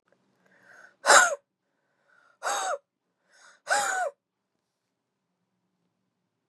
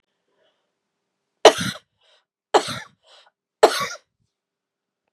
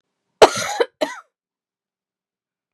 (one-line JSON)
{"exhalation_length": "6.5 s", "exhalation_amplitude": 22941, "exhalation_signal_mean_std_ratio": 0.27, "three_cough_length": "5.1 s", "three_cough_amplitude": 32768, "three_cough_signal_mean_std_ratio": 0.2, "cough_length": "2.7 s", "cough_amplitude": 32768, "cough_signal_mean_std_ratio": 0.22, "survey_phase": "beta (2021-08-13 to 2022-03-07)", "age": "18-44", "gender": "Female", "wearing_mask": "Yes", "symptom_cough_any": true, "symptom_runny_or_blocked_nose": true, "symptom_headache": true, "smoker_status": "Ex-smoker", "respiratory_condition_asthma": false, "respiratory_condition_other": false, "recruitment_source": "Test and Trace", "submission_delay": "3 days", "covid_test_result": "Positive", "covid_test_method": "RT-qPCR", "covid_ct_value": 32.5, "covid_ct_gene": "ORF1ab gene", "covid_ct_mean": 33.5, "covid_viral_load": "10 copies/ml", "covid_viral_load_category": "Minimal viral load (< 10K copies/ml)"}